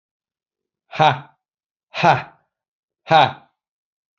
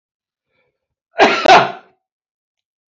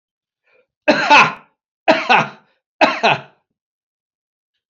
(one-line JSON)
{"exhalation_length": "4.2 s", "exhalation_amplitude": 32767, "exhalation_signal_mean_std_ratio": 0.29, "cough_length": "2.9 s", "cough_amplitude": 29030, "cough_signal_mean_std_ratio": 0.31, "three_cough_length": "4.7 s", "three_cough_amplitude": 30772, "three_cough_signal_mean_std_ratio": 0.37, "survey_phase": "beta (2021-08-13 to 2022-03-07)", "age": "65+", "gender": "Male", "wearing_mask": "No", "symptom_none": true, "smoker_status": "Never smoked", "respiratory_condition_asthma": false, "respiratory_condition_other": false, "recruitment_source": "REACT", "submission_delay": "2 days", "covid_test_result": "Negative", "covid_test_method": "RT-qPCR", "influenza_a_test_result": "Negative", "influenza_b_test_result": "Negative"}